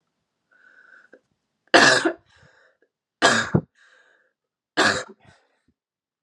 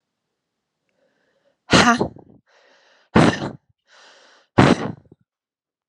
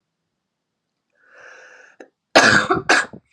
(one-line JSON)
{"three_cough_length": "6.2 s", "three_cough_amplitude": 29946, "three_cough_signal_mean_std_ratio": 0.29, "exhalation_length": "5.9 s", "exhalation_amplitude": 32767, "exhalation_signal_mean_std_ratio": 0.29, "cough_length": "3.3 s", "cough_amplitude": 32768, "cough_signal_mean_std_ratio": 0.33, "survey_phase": "beta (2021-08-13 to 2022-03-07)", "age": "18-44", "gender": "Female", "wearing_mask": "No", "symptom_cough_any": true, "symptom_runny_or_blocked_nose": true, "symptom_shortness_of_breath": true, "symptom_sore_throat": true, "symptom_abdominal_pain": true, "symptom_fatigue": true, "symptom_headache": true, "symptom_onset": "3 days", "smoker_status": "Never smoked", "respiratory_condition_asthma": false, "respiratory_condition_other": false, "recruitment_source": "Test and Trace", "submission_delay": "2 days", "covid_test_result": "Positive", "covid_test_method": "RT-qPCR", "covid_ct_value": 22.3, "covid_ct_gene": "ORF1ab gene", "covid_ct_mean": 23.3, "covid_viral_load": "22000 copies/ml", "covid_viral_load_category": "Low viral load (10K-1M copies/ml)"}